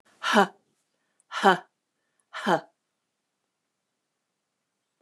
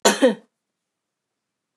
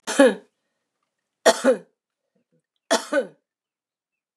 {"exhalation_length": "5.0 s", "exhalation_amplitude": 23804, "exhalation_signal_mean_std_ratio": 0.24, "cough_length": "1.8 s", "cough_amplitude": 28781, "cough_signal_mean_std_ratio": 0.28, "three_cough_length": "4.4 s", "three_cough_amplitude": 26694, "three_cough_signal_mean_std_ratio": 0.29, "survey_phase": "beta (2021-08-13 to 2022-03-07)", "age": "65+", "gender": "Female", "wearing_mask": "No", "symptom_none": true, "smoker_status": "Never smoked", "respiratory_condition_asthma": false, "respiratory_condition_other": false, "recruitment_source": "REACT", "submission_delay": "3 days", "covid_test_result": "Negative", "covid_test_method": "RT-qPCR", "influenza_a_test_result": "Negative", "influenza_b_test_result": "Negative"}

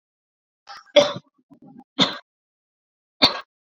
{"three_cough_length": "3.7 s", "three_cough_amplitude": 32767, "three_cough_signal_mean_std_ratio": 0.25, "survey_phase": "beta (2021-08-13 to 2022-03-07)", "age": "18-44", "gender": "Female", "wearing_mask": "No", "symptom_none": true, "smoker_status": "Never smoked", "respiratory_condition_asthma": false, "respiratory_condition_other": false, "recruitment_source": "REACT", "submission_delay": "1 day", "covid_test_result": "Negative", "covid_test_method": "RT-qPCR"}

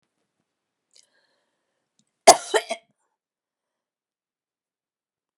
{"cough_length": "5.4 s", "cough_amplitude": 32768, "cough_signal_mean_std_ratio": 0.13, "survey_phase": "beta (2021-08-13 to 2022-03-07)", "age": "65+", "gender": "Female", "wearing_mask": "No", "symptom_none": true, "smoker_status": "Ex-smoker", "respiratory_condition_asthma": false, "respiratory_condition_other": false, "recruitment_source": "REACT", "submission_delay": "5 days", "covid_test_result": "Negative", "covid_test_method": "RT-qPCR", "influenza_a_test_result": "Negative", "influenza_b_test_result": "Negative"}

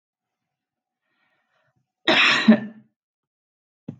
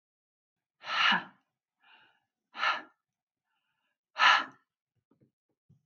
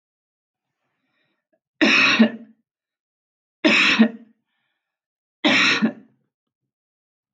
{"cough_length": "4.0 s", "cough_amplitude": 22707, "cough_signal_mean_std_ratio": 0.28, "exhalation_length": "5.9 s", "exhalation_amplitude": 14148, "exhalation_signal_mean_std_ratio": 0.28, "three_cough_length": "7.3 s", "three_cough_amplitude": 22020, "three_cough_signal_mean_std_ratio": 0.36, "survey_phase": "alpha (2021-03-01 to 2021-08-12)", "age": "18-44", "gender": "Female", "wearing_mask": "No", "symptom_none": true, "smoker_status": "Never smoked", "respiratory_condition_asthma": false, "respiratory_condition_other": false, "recruitment_source": "REACT", "submission_delay": "1 day", "covid_test_result": "Negative", "covid_test_method": "RT-qPCR"}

